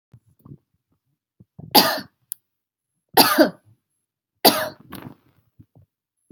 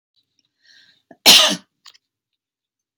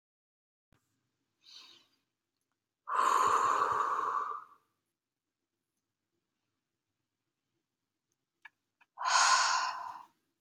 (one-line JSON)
{"three_cough_length": "6.3 s", "three_cough_amplitude": 32767, "three_cough_signal_mean_std_ratio": 0.26, "cough_length": "3.0 s", "cough_amplitude": 32768, "cough_signal_mean_std_ratio": 0.24, "exhalation_length": "10.4 s", "exhalation_amplitude": 6289, "exhalation_signal_mean_std_ratio": 0.39, "survey_phase": "beta (2021-08-13 to 2022-03-07)", "age": "18-44", "gender": "Female", "wearing_mask": "No", "symptom_none": true, "smoker_status": "Ex-smoker", "respiratory_condition_asthma": false, "respiratory_condition_other": false, "recruitment_source": "REACT", "submission_delay": "1 day", "covid_test_result": "Negative", "covid_test_method": "RT-qPCR"}